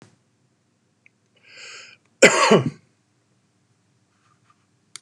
cough_length: 5.0 s
cough_amplitude: 32768
cough_signal_mean_std_ratio: 0.23
survey_phase: beta (2021-08-13 to 2022-03-07)
age: 45-64
gender: Male
wearing_mask: 'No'
symptom_none: true
smoker_status: Ex-smoker
respiratory_condition_asthma: false
respiratory_condition_other: false
recruitment_source: REACT
submission_delay: 0 days
covid_test_result: Negative
covid_test_method: RT-qPCR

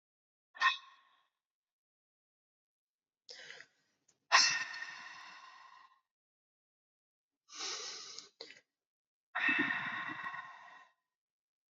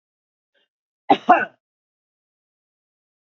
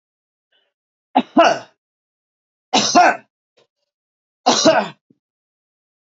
exhalation_length: 11.7 s
exhalation_amplitude: 8654
exhalation_signal_mean_std_ratio: 0.31
cough_length: 3.3 s
cough_amplitude: 32768
cough_signal_mean_std_ratio: 0.19
three_cough_length: 6.1 s
three_cough_amplitude: 30424
three_cough_signal_mean_std_ratio: 0.33
survey_phase: beta (2021-08-13 to 2022-03-07)
age: 45-64
gender: Female
wearing_mask: 'No'
symptom_none: true
smoker_status: Never smoked
respiratory_condition_asthma: false
respiratory_condition_other: false
recruitment_source: REACT
submission_delay: 1 day
covid_test_result: Negative
covid_test_method: RT-qPCR
influenza_a_test_result: Unknown/Void
influenza_b_test_result: Unknown/Void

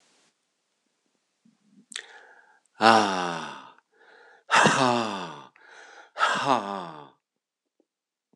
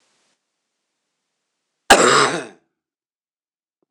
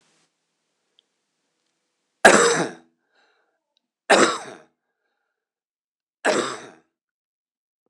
exhalation_length: 8.4 s
exhalation_amplitude: 25239
exhalation_signal_mean_std_ratio: 0.35
cough_length: 3.9 s
cough_amplitude: 26028
cough_signal_mean_std_ratio: 0.27
three_cough_length: 7.9 s
three_cough_amplitude: 26028
three_cough_signal_mean_std_ratio: 0.25
survey_phase: beta (2021-08-13 to 2022-03-07)
age: 65+
gender: Male
wearing_mask: 'No'
symptom_cough_any: true
symptom_sore_throat: true
symptom_loss_of_taste: true
symptom_onset: 5 days
smoker_status: Never smoked
respiratory_condition_asthma: false
respiratory_condition_other: false
recruitment_source: Test and Trace
submission_delay: 2 days
covid_test_result: Positive
covid_test_method: RT-qPCR
covid_ct_value: 14.7
covid_ct_gene: ORF1ab gene
covid_ct_mean: 15.0
covid_viral_load: 12000000 copies/ml
covid_viral_load_category: High viral load (>1M copies/ml)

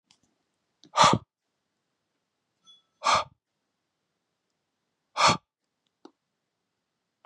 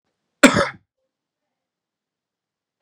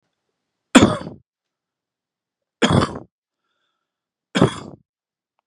exhalation_length: 7.3 s
exhalation_amplitude: 17730
exhalation_signal_mean_std_ratio: 0.22
cough_length: 2.8 s
cough_amplitude: 32768
cough_signal_mean_std_ratio: 0.19
three_cough_length: 5.5 s
three_cough_amplitude: 32768
three_cough_signal_mean_std_ratio: 0.25
survey_phase: beta (2021-08-13 to 2022-03-07)
age: 18-44
gender: Male
wearing_mask: 'No'
symptom_other: true
symptom_onset: 3 days
smoker_status: Never smoked
respiratory_condition_asthma: true
respiratory_condition_other: false
recruitment_source: REACT
submission_delay: 1 day
covid_test_result: Positive
covid_test_method: RT-qPCR
covid_ct_value: 29.0
covid_ct_gene: E gene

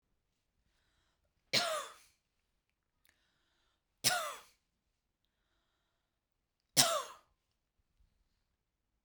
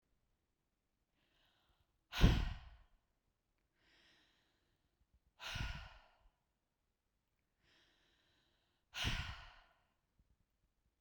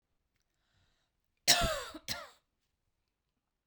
three_cough_length: 9.0 s
three_cough_amplitude: 13531
three_cough_signal_mean_std_ratio: 0.22
exhalation_length: 11.0 s
exhalation_amplitude: 5457
exhalation_signal_mean_std_ratio: 0.21
cough_length: 3.7 s
cough_amplitude: 10502
cough_signal_mean_std_ratio: 0.25
survey_phase: beta (2021-08-13 to 2022-03-07)
age: 18-44
gender: Female
wearing_mask: 'No'
symptom_runny_or_blocked_nose: true
symptom_sore_throat: true
symptom_headache: true
smoker_status: Never smoked
respiratory_condition_asthma: false
respiratory_condition_other: false
recruitment_source: Test and Trace
submission_delay: 1 day
covid_test_result: Positive
covid_test_method: RT-qPCR
covid_ct_value: 19.3
covid_ct_gene: ORF1ab gene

